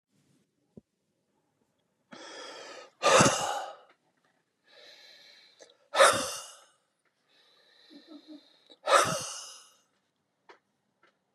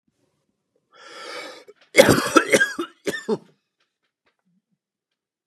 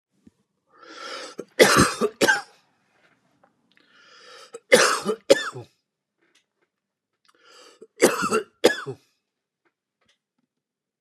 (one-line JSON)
{"exhalation_length": "11.3 s", "exhalation_amplitude": 16446, "exhalation_signal_mean_std_ratio": 0.28, "cough_length": "5.5 s", "cough_amplitude": 32768, "cough_signal_mean_std_ratio": 0.29, "three_cough_length": "11.0 s", "three_cough_amplitude": 31841, "three_cough_signal_mean_std_ratio": 0.29, "survey_phase": "beta (2021-08-13 to 2022-03-07)", "age": "65+", "gender": "Male", "wearing_mask": "No", "symptom_none": true, "smoker_status": "Never smoked", "respiratory_condition_asthma": false, "respiratory_condition_other": false, "recruitment_source": "REACT", "submission_delay": "1 day", "covid_test_result": "Negative", "covid_test_method": "RT-qPCR"}